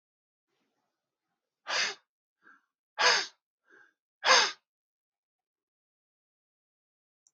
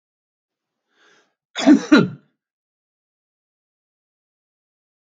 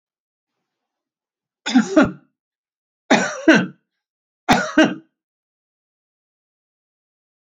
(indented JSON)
{
  "exhalation_length": "7.3 s",
  "exhalation_amplitude": 12053,
  "exhalation_signal_mean_std_ratio": 0.24,
  "cough_length": "5.0 s",
  "cough_amplitude": 27847,
  "cough_signal_mean_std_ratio": 0.21,
  "three_cough_length": "7.4 s",
  "three_cough_amplitude": 28025,
  "three_cough_signal_mean_std_ratio": 0.29,
  "survey_phase": "alpha (2021-03-01 to 2021-08-12)",
  "age": "65+",
  "gender": "Male",
  "wearing_mask": "No",
  "symptom_none": true,
  "smoker_status": "Ex-smoker",
  "respiratory_condition_asthma": false,
  "respiratory_condition_other": false,
  "recruitment_source": "REACT",
  "submission_delay": "5 days",
  "covid_test_result": "Negative",
  "covid_test_method": "RT-qPCR"
}